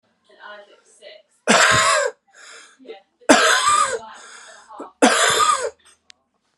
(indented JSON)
{
  "three_cough_length": "6.6 s",
  "three_cough_amplitude": 32768,
  "three_cough_signal_mean_std_ratio": 0.48,
  "survey_phase": "alpha (2021-03-01 to 2021-08-12)",
  "age": "18-44",
  "gender": "Male",
  "wearing_mask": "No",
  "symptom_none": true,
  "smoker_status": "Never smoked",
  "respiratory_condition_asthma": false,
  "respiratory_condition_other": false,
  "recruitment_source": "REACT",
  "submission_delay": "1 day",
  "covid_test_result": "Negative",
  "covid_test_method": "RT-qPCR"
}